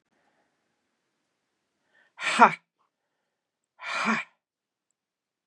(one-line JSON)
{"exhalation_length": "5.5 s", "exhalation_amplitude": 28816, "exhalation_signal_mean_std_ratio": 0.2, "survey_phase": "beta (2021-08-13 to 2022-03-07)", "age": "65+", "gender": "Female", "wearing_mask": "No", "symptom_runny_or_blocked_nose": true, "symptom_sore_throat": true, "symptom_fatigue": true, "symptom_headache": true, "symptom_other": true, "symptom_onset": "3 days", "smoker_status": "Never smoked", "respiratory_condition_asthma": false, "respiratory_condition_other": false, "recruitment_source": "Test and Trace", "submission_delay": "1 day", "covid_test_result": "Positive", "covid_test_method": "RT-qPCR", "covid_ct_value": 17.7, "covid_ct_gene": "ORF1ab gene", "covid_ct_mean": 18.9, "covid_viral_load": "630000 copies/ml", "covid_viral_load_category": "Low viral load (10K-1M copies/ml)"}